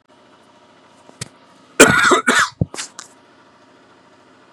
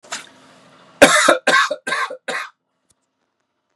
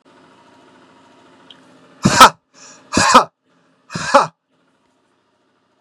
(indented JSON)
{
  "cough_length": "4.5 s",
  "cough_amplitude": 32768,
  "cough_signal_mean_std_ratio": 0.32,
  "three_cough_length": "3.8 s",
  "three_cough_amplitude": 32768,
  "three_cough_signal_mean_std_ratio": 0.38,
  "exhalation_length": "5.8 s",
  "exhalation_amplitude": 32768,
  "exhalation_signal_mean_std_ratio": 0.27,
  "survey_phase": "beta (2021-08-13 to 2022-03-07)",
  "age": "45-64",
  "gender": "Male",
  "wearing_mask": "No",
  "symptom_none": true,
  "smoker_status": "Ex-smoker",
  "respiratory_condition_asthma": false,
  "respiratory_condition_other": false,
  "recruitment_source": "REACT",
  "submission_delay": "2 days",
  "covid_test_result": "Negative",
  "covid_test_method": "RT-qPCR",
  "influenza_a_test_result": "Negative",
  "influenza_b_test_result": "Negative"
}